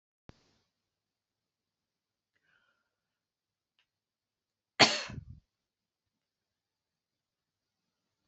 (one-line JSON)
{"three_cough_length": "8.3 s", "three_cough_amplitude": 13912, "three_cough_signal_mean_std_ratio": 0.12, "survey_phase": "beta (2021-08-13 to 2022-03-07)", "age": "45-64", "gender": "Female", "wearing_mask": "No", "symptom_none": true, "symptom_onset": "7 days", "smoker_status": "Never smoked", "respiratory_condition_asthma": true, "respiratory_condition_other": false, "recruitment_source": "REACT", "submission_delay": "4 days", "covid_test_result": "Negative", "covid_test_method": "RT-qPCR", "influenza_a_test_result": "Negative", "influenza_b_test_result": "Negative"}